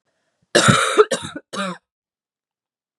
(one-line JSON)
{"cough_length": "3.0 s", "cough_amplitude": 32768, "cough_signal_mean_std_ratio": 0.37, "survey_phase": "beta (2021-08-13 to 2022-03-07)", "age": "18-44", "gender": "Female", "wearing_mask": "No", "symptom_cough_any": true, "symptom_runny_or_blocked_nose": true, "symptom_shortness_of_breath": true, "symptom_sore_throat": true, "symptom_fatigue": true, "symptom_headache": true, "smoker_status": "Never smoked", "respiratory_condition_asthma": true, "respiratory_condition_other": false, "recruitment_source": "Test and Trace", "submission_delay": "2 days", "covid_test_result": "Positive", "covid_test_method": "ePCR"}